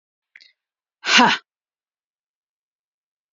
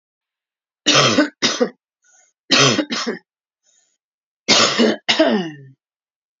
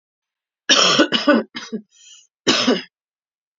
exhalation_length: 3.3 s
exhalation_amplitude: 28818
exhalation_signal_mean_std_ratio: 0.23
three_cough_length: 6.4 s
three_cough_amplitude: 32768
three_cough_signal_mean_std_ratio: 0.46
cough_length: 3.6 s
cough_amplitude: 31512
cough_signal_mean_std_ratio: 0.44
survey_phase: alpha (2021-03-01 to 2021-08-12)
age: 45-64
gender: Female
wearing_mask: 'No'
symptom_cough_any: true
symptom_diarrhoea: true
symptom_fatigue: true
symptom_headache: true
smoker_status: Current smoker (1 to 10 cigarettes per day)
respiratory_condition_asthma: false
respiratory_condition_other: false
recruitment_source: Test and Trace
submission_delay: 1 day
covid_test_result: Positive
covid_test_method: RT-qPCR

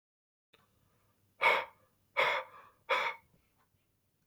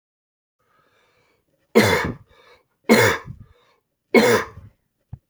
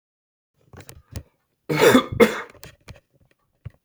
exhalation_length: 4.3 s
exhalation_amplitude: 5879
exhalation_signal_mean_std_ratio: 0.33
three_cough_length: 5.3 s
three_cough_amplitude: 28754
three_cough_signal_mean_std_ratio: 0.34
cough_length: 3.8 s
cough_amplitude: 29389
cough_signal_mean_std_ratio: 0.3
survey_phase: beta (2021-08-13 to 2022-03-07)
age: 18-44
gender: Male
wearing_mask: 'No'
symptom_runny_or_blocked_nose: true
symptom_sore_throat: true
symptom_abdominal_pain: true
symptom_fatigue: true
symptom_fever_high_temperature: true
symptom_onset: 3 days
smoker_status: Never smoked
respiratory_condition_asthma: false
respiratory_condition_other: false
recruitment_source: Test and Trace
submission_delay: 1 day
covid_test_result: Negative
covid_test_method: RT-qPCR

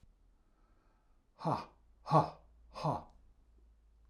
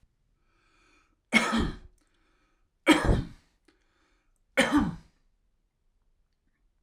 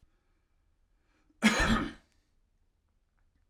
exhalation_length: 4.1 s
exhalation_amplitude: 6243
exhalation_signal_mean_std_ratio: 0.3
three_cough_length: 6.8 s
three_cough_amplitude: 15652
three_cough_signal_mean_std_ratio: 0.31
cough_length: 3.5 s
cough_amplitude: 8993
cough_signal_mean_std_ratio: 0.29
survey_phase: alpha (2021-03-01 to 2021-08-12)
age: 45-64
gender: Male
wearing_mask: 'No'
symptom_none: true
smoker_status: Ex-smoker
respiratory_condition_asthma: false
respiratory_condition_other: false
recruitment_source: REACT
submission_delay: 2 days
covid_test_result: Negative
covid_test_method: RT-qPCR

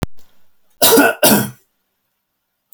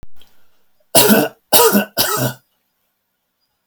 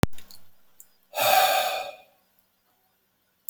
cough_length: 2.7 s
cough_amplitude: 32768
cough_signal_mean_std_ratio: 0.42
three_cough_length: 3.7 s
three_cough_amplitude: 32768
three_cough_signal_mean_std_ratio: 0.44
exhalation_length: 3.5 s
exhalation_amplitude: 26037
exhalation_signal_mean_std_ratio: 0.44
survey_phase: beta (2021-08-13 to 2022-03-07)
age: 65+
gender: Male
wearing_mask: 'No'
symptom_none: true
smoker_status: Never smoked
respiratory_condition_asthma: false
respiratory_condition_other: false
recruitment_source: REACT
submission_delay: 2 days
covid_test_result: Negative
covid_test_method: RT-qPCR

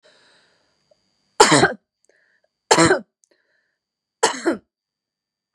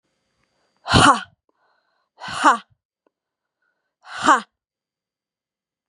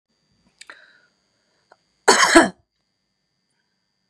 three_cough_length: 5.5 s
three_cough_amplitude: 32768
three_cough_signal_mean_std_ratio: 0.28
exhalation_length: 5.9 s
exhalation_amplitude: 30379
exhalation_signal_mean_std_ratio: 0.26
cough_length: 4.1 s
cough_amplitude: 32767
cough_signal_mean_std_ratio: 0.23
survey_phase: beta (2021-08-13 to 2022-03-07)
age: 45-64
gender: Female
wearing_mask: 'No'
symptom_headache: true
symptom_onset: 5 days
smoker_status: Never smoked
respiratory_condition_asthma: false
respiratory_condition_other: false
recruitment_source: Test and Trace
submission_delay: 3 days
covid_test_result: Negative
covid_test_method: RT-qPCR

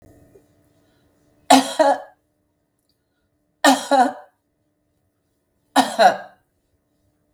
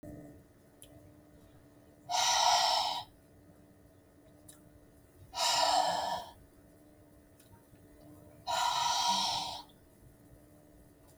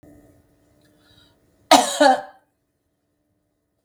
three_cough_length: 7.3 s
three_cough_amplitude: 32768
three_cough_signal_mean_std_ratio: 0.3
exhalation_length: 11.2 s
exhalation_amplitude: 6211
exhalation_signal_mean_std_ratio: 0.48
cough_length: 3.8 s
cough_amplitude: 32768
cough_signal_mean_std_ratio: 0.25
survey_phase: beta (2021-08-13 to 2022-03-07)
age: 45-64
gender: Female
wearing_mask: 'No'
symptom_none: true
smoker_status: Never smoked
respiratory_condition_asthma: false
respiratory_condition_other: false
recruitment_source: REACT
submission_delay: 1 day
covid_test_result: Negative
covid_test_method: RT-qPCR
influenza_a_test_result: Negative
influenza_b_test_result: Negative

